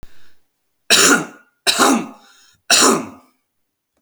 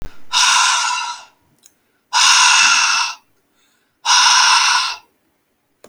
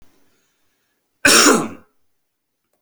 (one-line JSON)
{"three_cough_length": "4.0 s", "three_cough_amplitude": 32767, "three_cough_signal_mean_std_ratio": 0.44, "exhalation_length": "5.9 s", "exhalation_amplitude": 32768, "exhalation_signal_mean_std_ratio": 0.62, "cough_length": "2.8 s", "cough_amplitude": 32767, "cough_signal_mean_std_ratio": 0.31, "survey_phase": "alpha (2021-03-01 to 2021-08-12)", "age": "18-44", "gender": "Male", "wearing_mask": "No", "symptom_cough_any": true, "symptom_new_continuous_cough": true, "symptom_fatigue": true, "symptom_headache": true, "symptom_change_to_sense_of_smell_or_taste": true, "symptom_onset": "5 days", "smoker_status": "Never smoked", "respiratory_condition_asthma": false, "respiratory_condition_other": false, "recruitment_source": "Test and Trace", "submission_delay": "2 days", "covid_test_result": "Positive", "covid_test_method": "RT-qPCR", "covid_ct_value": 17.6, "covid_ct_gene": "S gene", "covid_ct_mean": 17.9, "covid_viral_load": "1300000 copies/ml", "covid_viral_load_category": "High viral load (>1M copies/ml)"}